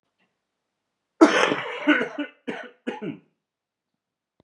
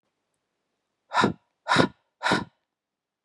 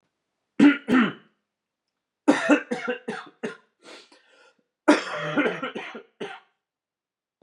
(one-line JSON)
{"cough_length": "4.4 s", "cough_amplitude": 27953, "cough_signal_mean_std_ratio": 0.33, "exhalation_length": "3.2 s", "exhalation_amplitude": 28552, "exhalation_signal_mean_std_ratio": 0.32, "three_cough_length": "7.4 s", "three_cough_amplitude": 23353, "three_cough_signal_mean_std_ratio": 0.36, "survey_phase": "beta (2021-08-13 to 2022-03-07)", "age": "18-44", "gender": "Male", "wearing_mask": "No", "symptom_cough_any": true, "symptom_runny_or_blocked_nose": true, "symptom_headache": true, "symptom_onset": "4 days", "smoker_status": "Never smoked", "respiratory_condition_asthma": false, "respiratory_condition_other": false, "recruitment_source": "Test and Trace", "submission_delay": "2 days", "covid_test_result": "Positive", "covid_test_method": "RT-qPCR", "covid_ct_value": 17.4, "covid_ct_gene": "ORF1ab gene"}